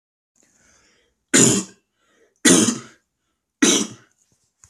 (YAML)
three_cough_length: 4.7 s
three_cough_amplitude: 31358
three_cough_signal_mean_std_ratio: 0.34
survey_phase: alpha (2021-03-01 to 2021-08-12)
age: 18-44
gender: Male
wearing_mask: 'No'
symptom_none: true
smoker_status: Never smoked
respiratory_condition_asthma: false
respiratory_condition_other: false
recruitment_source: REACT
submission_delay: 1 day
covid_test_result: Negative
covid_test_method: RT-qPCR